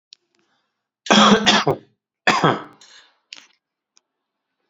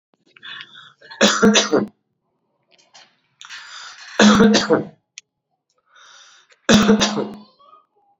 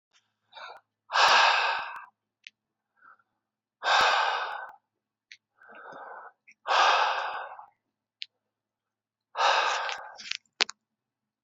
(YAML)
cough_length: 4.7 s
cough_amplitude: 32767
cough_signal_mean_std_ratio: 0.34
three_cough_length: 8.2 s
three_cough_amplitude: 32767
three_cough_signal_mean_std_ratio: 0.39
exhalation_length: 11.4 s
exhalation_amplitude: 24056
exhalation_signal_mean_std_ratio: 0.41
survey_phase: beta (2021-08-13 to 2022-03-07)
age: 18-44
gender: Male
wearing_mask: 'No'
symptom_none: true
smoker_status: Never smoked
respiratory_condition_asthma: false
respiratory_condition_other: false
recruitment_source: REACT
submission_delay: 1 day
covid_test_result: Negative
covid_test_method: RT-qPCR